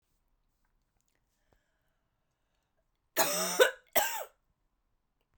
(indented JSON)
{
  "cough_length": "5.4 s",
  "cough_amplitude": 10412,
  "cough_signal_mean_std_ratio": 0.27,
  "survey_phase": "beta (2021-08-13 to 2022-03-07)",
  "age": "45-64",
  "gender": "Female",
  "wearing_mask": "No",
  "symptom_none": true,
  "smoker_status": "Never smoked",
  "respiratory_condition_asthma": false,
  "respiratory_condition_other": false,
  "recruitment_source": "REACT",
  "submission_delay": "1 day",
  "covid_test_result": "Negative",
  "covid_test_method": "RT-qPCR"
}